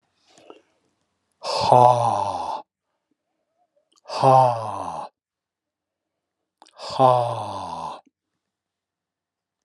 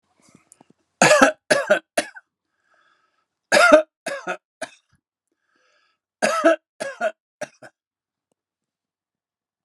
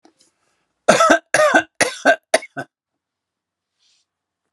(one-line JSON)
{"exhalation_length": "9.6 s", "exhalation_amplitude": 31308, "exhalation_signal_mean_std_ratio": 0.36, "three_cough_length": "9.6 s", "three_cough_amplitude": 32767, "three_cough_signal_mean_std_ratio": 0.3, "cough_length": "4.5 s", "cough_amplitude": 32768, "cough_signal_mean_std_ratio": 0.34, "survey_phase": "alpha (2021-03-01 to 2021-08-12)", "age": "65+", "gender": "Male", "wearing_mask": "No", "symptom_none": true, "smoker_status": "Ex-smoker", "respiratory_condition_asthma": false, "respiratory_condition_other": false, "recruitment_source": "REACT", "submission_delay": "5 days", "covid_test_result": "Negative", "covid_test_method": "RT-qPCR"}